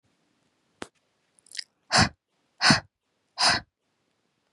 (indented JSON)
{
  "exhalation_length": "4.5 s",
  "exhalation_amplitude": 23965,
  "exhalation_signal_mean_std_ratio": 0.27,
  "survey_phase": "beta (2021-08-13 to 2022-03-07)",
  "age": "18-44",
  "gender": "Female",
  "wearing_mask": "No",
  "symptom_none": true,
  "symptom_onset": "8 days",
  "smoker_status": "Never smoked",
  "respiratory_condition_asthma": false,
  "respiratory_condition_other": false,
  "recruitment_source": "REACT",
  "submission_delay": "4 days",
  "covid_test_result": "Negative",
  "covid_test_method": "RT-qPCR",
  "influenza_a_test_result": "Negative",
  "influenza_b_test_result": "Negative"
}